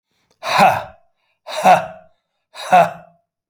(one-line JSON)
{"exhalation_length": "3.5 s", "exhalation_amplitude": 28245, "exhalation_signal_mean_std_ratio": 0.39, "survey_phase": "beta (2021-08-13 to 2022-03-07)", "age": "45-64", "gender": "Male", "wearing_mask": "No", "symptom_cough_any": true, "symptom_runny_or_blocked_nose": true, "symptom_sore_throat": true, "symptom_fatigue": true, "symptom_headache": true, "symptom_change_to_sense_of_smell_or_taste": true, "symptom_other": true, "smoker_status": "Never smoked", "respiratory_condition_asthma": false, "respiratory_condition_other": false, "recruitment_source": "Test and Trace", "submission_delay": "2 days", "covid_test_result": "Positive", "covid_test_method": "RT-qPCR", "covid_ct_value": 24.5, "covid_ct_gene": "ORF1ab gene", "covid_ct_mean": 25.3, "covid_viral_load": "5100 copies/ml", "covid_viral_load_category": "Minimal viral load (< 10K copies/ml)"}